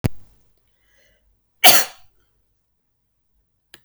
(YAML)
cough_length: 3.8 s
cough_amplitude: 32768
cough_signal_mean_std_ratio: 0.21
survey_phase: beta (2021-08-13 to 2022-03-07)
age: 18-44
gender: Female
wearing_mask: 'No'
symptom_none: true
smoker_status: Never smoked
respiratory_condition_asthma: false
respiratory_condition_other: false
recruitment_source: Test and Trace
submission_delay: 1 day
covid_test_result: Negative
covid_test_method: RT-qPCR